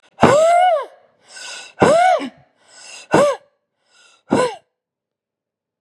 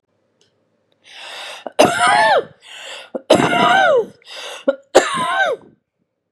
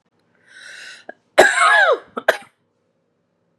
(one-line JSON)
{"exhalation_length": "5.8 s", "exhalation_amplitude": 32768, "exhalation_signal_mean_std_ratio": 0.47, "three_cough_length": "6.3 s", "three_cough_amplitude": 32768, "three_cough_signal_mean_std_ratio": 0.51, "cough_length": "3.6 s", "cough_amplitude": 32768, "cough_signal_mean_std_ratio": 0.36, "survey_phase": "beta (2021-08-13 to 2022-03-07)", "age": "18-44", "gender": "Female", "wearing_mask": "No", "symptom_cough_any": true, "symptom_runny_or_blocked_nose": true, "symptom_fatigue": true, "symptom_fever_high_temperature": true, "symptom_headache": true, "symptom_onset": "10 days", "smoker_status": "Never smoked", "respiratory_condition_asthma": false, "respiratory_condition_other": false, "recruitment_source": "REACT", "submission_delay": "1 day", "covid_test_result": "Positive", "covid_test_method": "RT-qPCR", "covid_ct_value": 31.2, "covid_ct_gene": "N gene", "influenza_a_test_result": "Negative", "influenza_b_test_result": "Negative"}